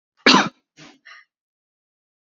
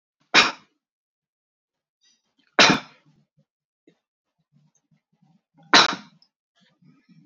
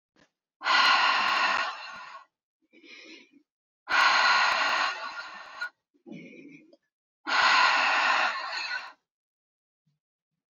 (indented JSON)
{
  "cough_length": "2.3 s",
  "cough_amplitude": 30054,
  "cough_signal_mean_std_ratio": 0.24,
  "three_cough_length": "7.3 s",
  "three_cough_amplitude": 32231,
  "three_cough_signal_mean_std_ratio": 0.21,
  "exhalation_length": "10.5 s",
  "exhalation_amplitude": 12007,
  "exhalation_signal_mean_std_ratio": 0.54,
  "survey_phase": "beta (2021-08-13 to 2022-03-07)",
  "age": "45-64",
  "gender": "Female",
  "wearing_mask": "No",
  "symptom_none": true,
  "smoker_status": "Never smoked",
  "respiratory_condition_asthma": false,
  "respiratory_condition_other": false,
  "recruitment_source": "REACT",
  "submission_delay": "1 day",
  "covid_test_result": "Negative",
  "covid_test_method": "RT-qPCR"
}